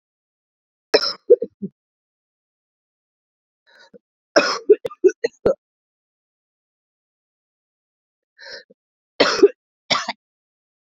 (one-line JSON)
{"three_cough_length": "10.9 s", "three_cough_amplitude": 28396, "three_cough_signal_mean_std_ratio": 0.23, "survey_phase": "beta (2021-08-13 to 2022-03-07)", "age": "45-64", "gender": "Female", "wearing_mask": "Yes", "symptom_cough_any": true, "symptom_new_continuous_cough": true, "symptom_sore_throat": true, "symptom_headache": true, "symptom_change_to_sense_of_smell_or_taste": true, "symptom_loss_of_taste": true, "symptom_onset": "4 days", "smoker_status": "Ex-smoker", "respiratory_condition_asthma": false, "respiratory_condition_other": false, "recruitment_source": "Test and Trace", "submission_delay": "2 days", "covid_test_result": "Positive", "covid_test_method": "RT-qPCR", "covid_ct_value": 18.3, "covid_ct_gene": "ORF1ab gene"}